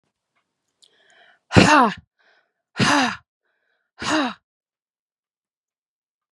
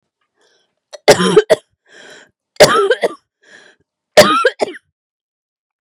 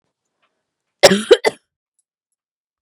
{"exhalation_length": "6.3 s", "exhalation_amplitude": 32768, "exhalation_signal_mean_std_ratio": 0.29, "three_cough_length": "5.8 s", "three_cough_amplitude": 32768, "three_cough_signal_mean_std_ratio": 0.35, "cough_length": "2.8 s", "cough_amplitude": 32768, "cough_signal_mean_std_ratio": 0.23, "survey_phase": "beta (2021-08-13 to 2022-03-07)", "age": "18-44", "gender": "Female", "wearing_mask": "No", "symptom_runny_or_blocked_nose": true, "symptom_sore_throat": true, "symptom_fatigue": true, "symptom_headache": true, "symptom_other": true, "smoker_status": "Current smoker (e-cigarettes or vapes only)", "respiratory_condition_asthma": true, "respiratory_condition_other": false, "recruitment_source": "Test and Trace", "submission_delay": "-1 day", "covid_test_result": "Negative", "covid_test_method": "LFT"}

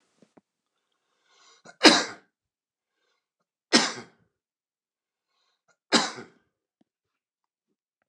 {"three_cough_length": "8.1 s", "three_cough_amplitude": 29203, "three_cough_signal_mean_std_ratio": 0.18, "survey_phase": "beta (2021-08-13 to 2022-03-07)", "age": "45-64", "gender": "Male", "wearing_mask": "No", "symptom_none": true, "smoker_status": "Ex-smoker", "respiratory_condition_asthma": false, "respiratory_condition_other": false, "recruitment_source": "REACT", "submission_delay": "1 day", "covid_test_result": "Negative", "covid_test_method": "RT-qPCR", "influenza_a_test_result": "Negative", "influenza_b_test_result": "Negative"}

